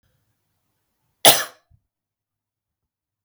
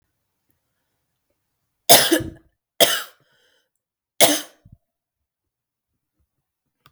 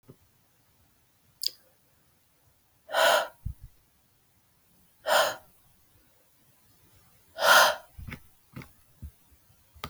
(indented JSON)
{
  "cough_length": "3.2 s",
  "cough_amplitude": 32768,
  "cough_signal_mean_std_ratio": 0.16,
  "three_cough_length": "6.9 s",
  "three_cough_amplitude": 32768,
  "three_cough_signal_mean_std_ratio": 0.23,
  "exhalation_length": "9.9 s",
  "exhalation_amplitude": 15745,
  "exhalation_signal_mean_std_ratio": 0.28,
  "survey_phase": "beta (2021-08-13 to 2022-03-07)",
  "age": "18-44",
  "gender": "Female",
  "wearing_mask": "No",
  "symptom_cough_any": true,
  "symptom_onset": "13 days",
  "smoker_status": "Never smoked",
  "respiratory_condition_asthma": false,
  "respiratory_condition_other": false,
  "recruitment_source": "REACT",
  "submission_delay": "3 days",
  "covid_test_result": "Negative",
  "covid_test_method": "RT-qPCR",
  "influenza_a_test_result": "Negative",
  "influenza_b_test_result": "Negative"
}